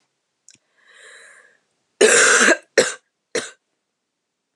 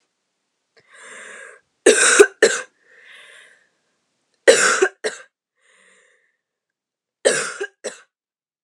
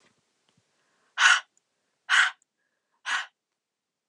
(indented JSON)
{
  "cough_length": "4.6 s",
  "cough_amplitude": 31416,
  "cough_signal_mean_std_ratio": 0.33,
  "three_cough_length": "8.6 s",
  "three_cough_amplitude": 32768,
  "three_cough_signal_mean_std_ratio": 0.29,
  "exhalation_length": "4.1 s",
  "exhalation_amplitude": 18898,
  "exhalation_signal_mean_std_ratio": 0.28,
  "survey_phase": "beta (2021-08-13 to 2022-03-07)",
  "age": "18-44",
  "gender": "Female",
  "wearing_mask": "No",
  "symptom_cough_any": true,
  "symptom_new_continuous_cough": true,
  "symptom_runny_or_blocked_nose": true,
  "symptom_shortness_of_breath": true,
  "symptom_fatigue": true,
  "symptom_headache": true,
  "symptom_other": true,
  "smoker_status": "Current smoker (e-cigarettes or vapes only)",
  "respiratory_condition_asthma": false,
  "respiratory_condition_other": false,
  "recruitment_source": "Test and Trace",
  "submission_delay": "1 day",
  "covid_test_result": "Positive",
  "covid_test_method": "RT-qPCR",
  "covid_ct_value": 31.2,
  "covid_ct_gene": "ORF1ab gene"
}